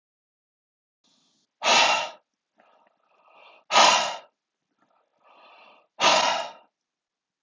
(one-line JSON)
{"exhalation_length": "7.4 s", "exhalation_amplitude": 22688, "exhalation_signal_mean_std_ratio": 0.33, "survey_phase": "alpha (2021-03-01 to 2021-08-12)", "age": "45-64", "gender": "Male", "wearing_mask": "No", "symptom_none": true, "smoker_status": "Never smoked", "respiratory_condition_asthma": false, "respiratory_condition_other": false, "recruitment_source": "REACT", "submission_delay": "1 day", "covid_test_result": "Negative", "covid_test_method": "RT-qPCR"}